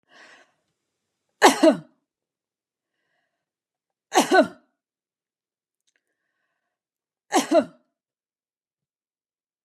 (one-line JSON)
{"three_cough_length": "9.6 s", "three_cough_amplitude": 32265, "three_cough_signal_mean_std_ratio": 0.22, "survey_phase": "beta (2021-08-13 to 2022-03-07)", "age": "45-64", "gender": "Female", "wearing_mask": "No", "symptom_runny_or_blocked_nose": true, "smoker_status": "Ex-smoker", "respiratory_condition_asthma": false, "respiratory_condition_other": false, "recruitment_source": "REACT", "submission_delay": "0 days", "covid_test_result": "Negative", "covid_test_method": "RT-qPCR"}